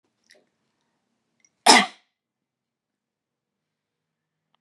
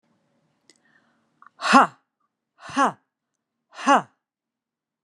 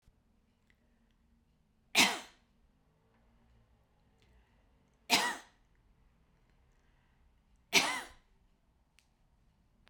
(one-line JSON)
{"cough_length": "4.6 s", "cough_amplitude": 30764, "cough_signal_mean_std_ratio": 0.15, "exhalation_length": "5.0 s", "exhalation_amplitude": 31835, "exhalation_signal_mean_std_ratio": 0.24, "three_cough_length": "9.9 s", "three_cough_amplitude": 9489, "three_cough_signal_mean_std_ratio": 0.22, "survey_phase": "beta (2021-08-13 to 2022-03-07)", "age": "65+", "gender": "Female", "wearing_mask": "No", "symptom_none": true, "smoker_status": "Ex-smoker", "respiratory_condition_asthma": false, "respiratory_condition_other": false, "recruitment_source": "REACT", "submission_delay": "12 days", "covid_test_result": "Negative", "covid_test_method": "RT-qPCR"}